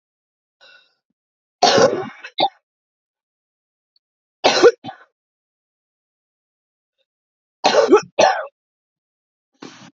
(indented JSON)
{
  "three_cough_length": "10.0 s",
  "three_cough_amplitude": 31595,
  "three_cough_signal_mean_std_ratio": 0.29,
  "survey_phase": "beta (2021-08-13 to 2022-03-07)",
  "age": "18-44",
  "gender": "Female",
  "wearing_mask": "No",
  "symptom_cough_any": true,
  "symptom_fatigue": true,
  "symptom_headache": true,
  "symptom_onset": "10 days",
  "smoker_status": "Current smoker (1 to 10 cigarettes per day)",
  "respiratory_condition_asthma": false,
  "respiratory_condition_other": false,
  "recruitment_source": "REACT",
  "submission_delay": "2 days",
  "covid_test_result": "Negative",
  "covid_test_method": "RT-qPCR",
  "influenza_a_test_result": "Negative",
  "influenza_b_test_result": "Negative"
}